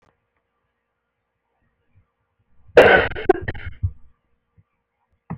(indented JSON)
{
  "cough_length": "5.4 s",
  "cough_amplitude": 28395,
  "cough_signal_mean_std_ratio": 0.25,
  "survey_phase": "beta (2021-08-13 to 2022-03-07)",
  "age": "45-64",
  "gender": "Female",
  "wearing_mask": "No",
  "symptom_cough_any": true,
  "symptom_runny_or_blocked_nose": true,
  "symptom_fatigue": true,
  "symptom_headache": true,
  "smoker_status": "Never smoked",
  "respiratory_condition_asthma": false,
  "respiratory_condition_other": false,
  "recruitment_source": "Test and Trace",
  "submission_delay": "2 days",
  "covid_test_result": "Positive",
  "covid_test_method": "RT-qPCR",
  "covid_ct_value": 16.3,
  "covid_ct_gene": "ORF1ab gene",
  "covid_ct_mean": 16.8,
  "covid_viral_load": "3100000 copies/ml",
  "covid_viral_load_category": "High viral load (>1M copies/ml)"
}